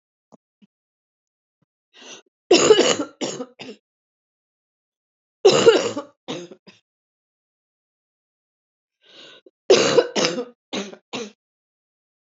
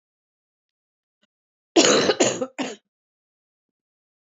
{"three_cough_length": "12.4 s", "three_cough_amplitude": 26654, "three_cough_signal_mean_std_ratio": 0.29, "cough_length": "4.4 s", "cough_amplitude": 27973, "cough_signal_mean_std_ratio": 0.3, "survey_phase": "beta (2021-08-13 to 2022-03-07)", "age": "65+", "gender": "Female", "wearing_mask": "No", "symptom_cough_any": true, "symptom_fatigue": true, "symptom_fever_high_temperature": true, "symptom_change_to_sense_of_smell_or_taste": true, "symptom_onset": "9 days", "smoker_status": "Never smoked", "respiratory_condition_asthma": false, "respiratory_condition_other": false, "recruitment_source": "Test and Trace", "submission_delay": "2 days", "covid_test_result": "Positive", "covid_test_method": "RT-qPCR", "covid_ct_value": 14.7, "covid_ct_gene": "ORF1ab gene", "covid_ct_mean": 14.9, "covid_viral_load": "13000000 copies/ml", "covid_viral_load_category": "High viral load (>1M copies/ml)"}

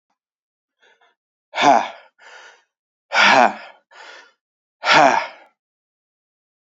{"exhalation_length": "6.7 s", "exhalation_amplitude": 30482, "exhalation_signal_mean_std_ratio": 0.32, "survey_phase": "beta (2021-08-13 to 2022-03-07)", "age": "18-44", "gender": "Male", "wearing_mask": "No", "symptom_cough_any": true, "symptom_runny_or_blocked_nose": true, "symptom_sore_throat": true, "symptom_fatigue": true, "symptom_headache": true, "symptom_change_to_sense_of_smell_or_taste": true, "symptom_loss_of_taste": true, "symptom_onset": "4 days", "smoker_status": "Never smoked", "respiratory_condition_asthma": false, "respiratory_condition_other": false, "recruitment_source": "Test and Trace", "submission_delay": "1 day", "covid_test_result": "Positive", "covid_test_method": "RT-qPCR", "covid_ct_value": 19.6, "covid_ct_gene": "ORF1ab gene"}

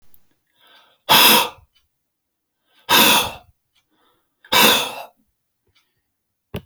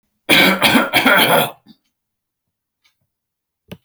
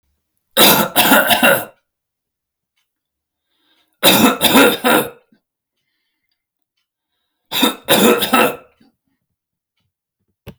{"exhalation_length": "6.7 s", "exhalation_amplitude": 32768, "exhalation_signal_mean_std_ratio": 0.34, "cough_length": "3.8 s", "cough_amplitude": 32070, "cough_signal_mean_std_ratio": 0.45, "three_cough_length": "10.6 s", "three_cough_amplitude": 32768, "three_cough_signal_mean_std_ratio": 0.41, "survey_phase": "beta (2021-08-13 to 2022-03-07)", "age": "65+", "gender": "Male", "wearing_mask": "No", "symptom_none": true, "smoker_status": "Never smoked", "respiratory_condition_asthma": false, "respiratory_condition_other": false, "recruitment_source": "REACT", "submission_delay": "1 day", "covid_test_result": "Negative", "covid_test_method": "RT-qPCR"}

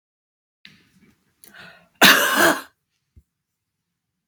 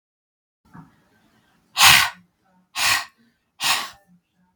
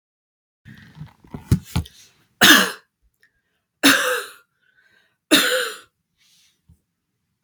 {"cough_length": "4.3 s", "cough_amplitude": 32767, "cough_signal_mean_std_ratio": 0.28, "exhalation_length": "4.6 s", "exhalation_amplitude": 32768, "exhalation_signal_mean_std_ratio": 0.31, "three_cough_length": "7.4 s", "three_cough_amplitude": 32767, "three_cough_signal_mean_std_ratio": 0.31, "survey_phase": "beta (2021-08-13 to 2022-03-07)", "age": "45-64", "gender": "Female", "wearing_mask": "No", "symptom_prefer_not_to_say": true, "smoker_status": "Never smoked", "respiratory_condition_asthma": false, "respiratory_condition_other": false, "recruitment_source": "REACT", "submission_delay": "1 day", "covid_test_result": "Negative", "covid_test_method": "RT-qPCR", "influenza_a_test_result": "Unknown/Void", "influenza_b_test_result": "Unknown/Void"}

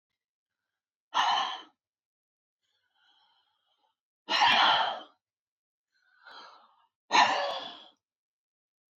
{"exhalation_length": "9.0 s", "exhalation_amplitude": 11634, "exhalation_signal_mean_std_ratio": 0.33, "survey_phase": "beta (2021-08-13 to 2022-03-07)", "age": "18-44", "gender": "Female", "wearing_mask": "No", "symptom_none": true, "smoker_status": "Never smoked", "respiratory_condition_asthma": false, "respiratory_condition_other": false, "recruitment_source": "REACT", "submission_delay": "1 day", "covid_test_result": "Negative", "covid_test_method": "RT-qPCR"}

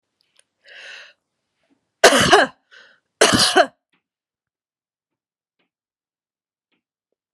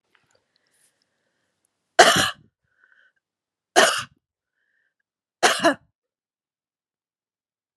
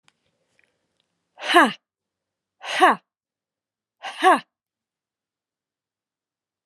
{"cough_length": "7.3 s", "cough_amplitude": 32768, "cough_signal_mean_std_ratio": 0.26, "three_cough_length": "7.8 s", "three_cough_amplitude": 32768, "three_cough_signal_mean_std_ratio": 0.23, "exhalation_length": "6.7 s", "exhalation_amplitude": 30094, "exhalation_signal_mean_std_ratio": 0.24, "survey_phase": "alpha (2021-03-01 to 2021-08-12)", "age": "45-64", "gender": "Female", "wearing_mask": "No", "symptom_none": true, "smoker_status": "Never smoked", "respiratory_condition_asthma": false, "respiratory_condition_other": false, "recruitment_source": "REACT", "submission_delay": "2 days", "covid_test_result": "Negative", "covid_test_method": "RT-qPCR"}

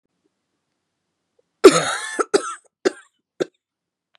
{"cough_length": "4.2 s", "cough_amplitude": 32768, "cough_signal_mean_std_ratio": 0.24, "survey_phase": "beta (2021-08-13 to 2022-03-07)", "age": "45-64", "gender": "Female", "wearing_mask": "No", "symptom_new_continuous_cough": true, "symptom_runny_or_blocked_nose": true, "symptom_shortness_of_breath": true, "symptom_sore_throat": true, "symptom_fatigue": true, "symptom_fever_high_temperature": true, "symptom_headache": true, "symptom_onset": "5 days", "smoker_status": "Ex-smoker", "respiratory_condition_asthma": false, "respiratory_condition_other": false, "recruitment_source": "Test and Trace", "submission_delay": "1 day", "covid_test_result": "Positive", "covid_test_method": "RT-qPCR", "covid_ct_value": 20.9, "covid_ct_gene": "ORF1ab gene"}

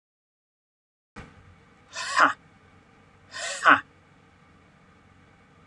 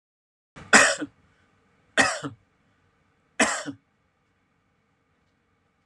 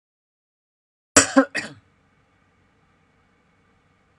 {"exhalation_length": "5.7 s", "exhalation_amplitude": 24039, "exhalation_signal_mean_std_ratio": 0.24, "three_cough_length": "5.9 s", "three_cough_amplitude": 26949, "three_cough_signal_mean_std_ratio": 0.25, "cough_length": "4.2 s", "cough_amplitude": 32768, "cough_signal_mean_std_ratio": 0.18, "survey_phase": "alpha (2021-03-01 to 2021-08-12)", "age": "45-64", "gender": "Male", "wearing_mask": "No", "symptom_none": true, "smoker_status": "Ex-smoker", "respiratory_condition_asthma": false, "respiratory_condition_other": false, "recruitment_source": "REACT", "submission_delay": "2 days", "covid_test_result": "Negative", "covid_test_method": "RT-qPCR"}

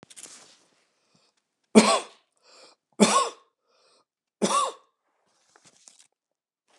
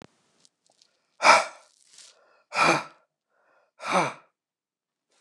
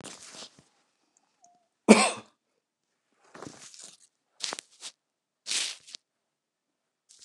{"three_cough_length": "6.8 s", "three_cough_amplitude": 29204, "three_cough_signal_mean_std_ratio": 0.25, "exhalation_length": "5.2 s", "exhalation_amplitude": 26347, "exhalation_signal_mean_std_ratio": 0.28, "cough_length": "7.2 s", "cough_amplitude": 29204, "cough_signal_mean_std_ratio": 0.18, "survey_phase": "beta (2021-08-13 to 2022-03-07)", "age": "65+", "gender": "Male", "wearing_mask": "No", "symptom_none": true, "smoker_status": "Never smoked", "respiratory_condition_asthma": true, "respiratory_condition_other": false, "recruitment_source": "REACT", "submission_delay": "2 days", "covid_test_result": "Negative", "covid_test_method": "RT-qPCR", "influenza_a_test_result": "Negative", "influenza_b_test_result": "Negative"}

